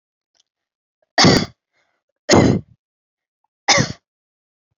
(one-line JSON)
{"three_cough_length": "4.8 s", "three_cough_amplitude": 32768, "three_cough_signal_mean_std_ratio": 0.32, "survey_phase": "beta (2021-08-13 to 2022-03-07)", "age": "18-44", "gender": "Female", "wearing_mask": "No", "symptom_none": true, "smoker_status": "Never smoked", "respiratory_condition_asthma": true, "respiratory_condition_other": false, "recruitment_source": "Test and Trace", "submission_delay": "-1 day", "covid_test_result": "Negative", "covid_test_method": "LFT"}